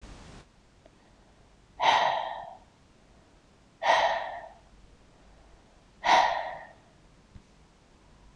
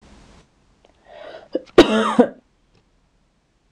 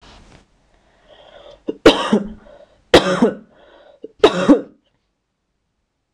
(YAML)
exhalation_length: 8.4 s
exhalation_amplitude: 12942
exhalation_signal_mean_std_ratio: 0.37
cough_length: 3.7 s
cough_amplitude: 26028
cough_signal_mean_std_ratio: 0.27
three_cough_length: 6.1 s
three_cough_amplitude: 26028
three_cough_signal_mean_std_ratio: 0.31
survey_phase: beta (2021-08-13 to 2022-03-07)
age: 18-44
gender: Female
wearing_mask: 'No'
symptom_cough_any: true
symptom_sore_throat: true
symptom_onset: 2 days
smoker_status: Ex-smoker
respiratory_condition_asthma: false
respiratory_condition_other: false
recruitment_source: Test and Trace
submission_delay: 1 day
covid_test_method: RT-qPCR
covid_ct_value: 35.9
covid_ct_gene: N gene
covid_ct_mean: 35.9
covid_viral_load: 1.7 copies/ml
covid_viral_load_category: Minimal viral load (< 10K copies/ml)